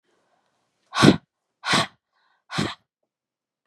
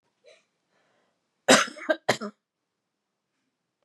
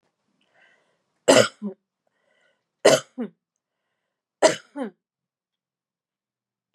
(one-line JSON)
{"exhalation_length": "3.7 s", "exhalation_amplitude": 32529, "exhalation_signal_mean_std_ratio": 0.27, "cough_length": "3.8 s", "cough_amplitude": 23984, "cough_signal_mean_std_ratio": 0.22, "three_cough_length": "6.7 s", "three_cough_amplitude": 27304, "three_cough_signal_mean_std_ratio": 0.22, "survey_phase": "beta (2021-08-13 to 2022-03-07)", "age": "18-44", "gender": "Female", "wearing_mask": "No", "symptom_cough_any": true, "symptom_runny_or_blocked_nose": true, "symptom_fatigue": true, "smoker_status": "Ex-smoker", "respiratory_condition_asthma": false, "respiratory_condition_other": false, "recruitment_source": "REACT", "submission_delay": "3 days", "covid_test_result": "Negative", "covid_test_method": "RT-qPCR", "influenza_a_test_result": "Negative", "influenza_b_test_result": "Negative"}